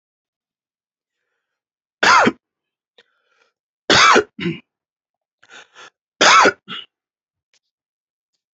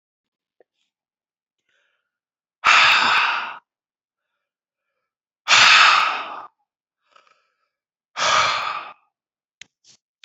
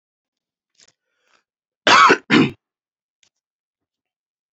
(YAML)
three_cough_length: 8.5 s
three_cough_amplitude: 32037
three_cough_signal_mean_std_ratio: 0.29
exhalation_length: 10.2 s
exhalation_amplitude: 31226
exhalation_signal_mean_std_ratio: 0.36
cough_length: 4.5 s
cough_amplitude: 29110
cough_signal_mean_std_ratio: 0.26
survey_phase: beta (2021-08-13 to 2022-03-07)
age: 45-64
gender: Male
wearing_mask: 'No'
symptom_headache: true
symptom_onset: 11 days
smoker_status: Never smoked
respiratory_condition_asthma: false
respiratory_condition_other: false
recruitment_source: REACT
submission_delay: 3 days
covid_test_result: Positive
covid_test_method: RT-qPCR
covid_ct_value: 25.0
covid_ct_gene: E gene
influenza_a_test_result: Negative
influenza_b_test_result: Negative